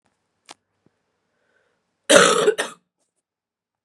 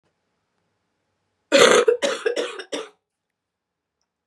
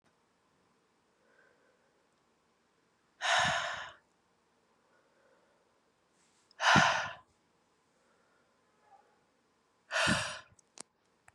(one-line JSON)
{"cough_length": "3.8 s", "cough_amplitude": 32768, "cough_signal_mean_std_ratio": 0.27, "three_cough_length": "4.3 s", "three_cough_amplitude": 32767, "three_cough_signal_mean_std_ratio": 0.33, "exhalation_length": "11.3 s", "exhalation_amplitude": 9324, "exhalation_signal_mean_std_ratio": 0.28, "survey_phase": "beta (2021-08-13 to 2022-03-07)", "age": "18-44", "gender": "Female", "wearing_mask": "No", "symptom_cough_any": true, "symptom_new_continuous_cough": true, "symptom_runny_or_blocked_nose": true, "symptom_fatigue": true, "symptom_fever_high_temperature": true, "symptom_headache": true, "symptom_change_to_sense_of_smell_or_taste": true, "symptom_onset": "4 days", "smoker_status": "Ex-smoker", "respiratory_condition_asthma": false, "respiratory_condition_other": false, "recruitment_source": "Test and Trace", "submission_delay": "2 days", "covid_test_result": "Positive", "covid_test_method": "ePCR"}